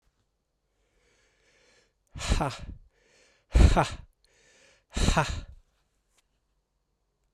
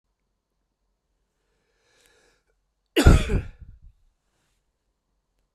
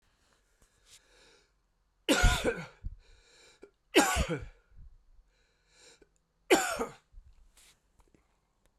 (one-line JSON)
{"exhalation_length": "7.3 s", "exhalation_amplitude": 16444, "exhalation_signal_mean_std_ratio": 0.29, "cough_length": "5.5 s", "cough_amplitude": 32768, "cough_signal_mean_std_ratio": 0.2, "three_cough_length": "8.8 s", "three_cough_amplitude": 12662, "three_cough_signal_mean_std_ratio": 0.3, "survey_phase": "beta (2021-08-13 to 2022-03-07)", "age": "45-64", "gender": "Male", "wearing_mask": "No", "symptom_cough_any": true, "symptom_runny_or_blocked_nose": true, "symptom_fatigue": true, "symptom_fever_high_temperature": true, "symptom_headache": true, "symptom_loss_of_taste": true, "symptom_onset": "2 days", "smoker_status": "Never smoked", "respiratory_condition_asthma": false, "respiratory_condition_other": false, "recruitment_source": "Test and Trace", "submission_delay": "1 day", "covid_test_result": "Positive", "covid_test_method": "RT-qPCR", "covid_ct_value": 14.6, "covid_ct_gene": "ORF1ab gene", "covid_ct_mean": 15.0, "covid_viral_load": "12000000 copies/ml", "covid_viral_load_category": "High viral load (>1M copies/ml)"}